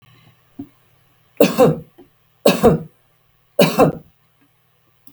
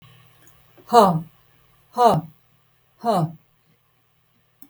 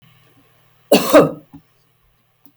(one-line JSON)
{"three_cough_length": "5.1 s", "three_cough_amplitude": 32768, "three_cough_signal_mean_std_ratio": 0.34, "exhalation_length": "4.7 s", "exhalation_amplitude": 32768, "exhalation_signal_mean_std_ratio": 0.32, "cough_length": "2.6 s", "cough_amplitude": 32768, "cough_signal_mean_std_ratio": 0.29, "survey_phase": "beta (2021-08-13 to 2022-03-07)", "age": "65+", "gender": "Female", "wearing_mask": "No", "symptom_none": true, "smoker_status": "Never smoked", "respiratory_condition_asthma": false, "respiratory_condition_other": false, "recruitment_source": "REACT", "submission_delay": "1 day", "covid_test_result": "Negative", "covid_test_method": "RT-qPCR", "influenza_a_test_result": "Negative", "influenza_b_test_result": "Negative"}